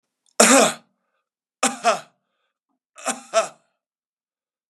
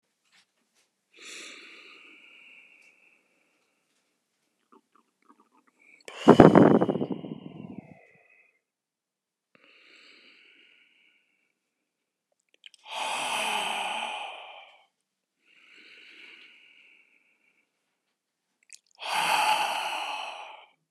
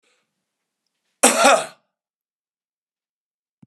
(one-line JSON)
{"three_cough_length": "4.7 s", "three_cough_amplitude": 32767, "three_cough_signal_mean_std_ratio": 0.3, "exhalation_length": "20.9 s", "exhalation_amplitude": 32768, "exhalation_signal_mean_std_ratio": 0.25, "cough_length": "3.7 s", "cough_amplitude": 32767, "cough_signal_mean_std_ratio": 0.25, "survey_phase": "beta (2021-08-13 to 2022-03-07)", "age": "65+", "gender": "Male", "wearing_mask": "No", "symptom_cough_any": true, "symptom_runny_or_blocked_nose": true, "symptom_shortness_of_breath": true, "symptom_sore_throat": true, "symptom_fatigue": true, "symptom_fever_high_temperature": true, "symptom_headache": true, "smoker_status": "Ex-smoker", "respiratory_condition_asthma": false, "respiratory_condition_other": true, "recruitment_source": "Test and Trace", "submission_delay": "0 days", "covid_test_result": "Positive", "covid_test_method": "LFT"}